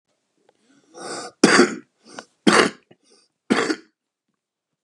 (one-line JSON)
{"three_cough_length": "4.8 s", "three_cough_amplitude": 32567, "three_cough_signal_mean_std_ratio": 0.31, "survey_phase": "beta (2021-08-13 to 2022-03-07)", "age": "45-64", "gender": "Male", "wearing_mask": "No", "symptom_runny_or_blocked_nose": true, "smoker_status": "Current smoker (11 or more cigarettes per day)", "respiratory_condition_asthma": false, "respiratory_condition_other": false, "recruitment_source": "Test and Trace", "submission_delay": "1 day", "covid_test_result": "Positive", "covid_test_method": "LFT"}